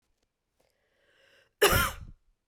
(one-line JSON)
{"cough_length": "2.5 s", "cough_amplitude": 13658, "cough_signal_mean_std_ratio": 0.28, "survey_phase": "beta (2021-08-13 to 2022-03-07)", "age": "45-64", "gender": "Female", "wearing_mask": "No", "symptom_cough_any": true, "smoker_status": "Ex-smoker", "respiratory_condition_asthma": false, "respiratory_condition_other": false, "recruitment_source": "REACT", "submission_delay": "1 day", "covid_test_result": "Negative", "covid_test_method": "RT-qPCR"}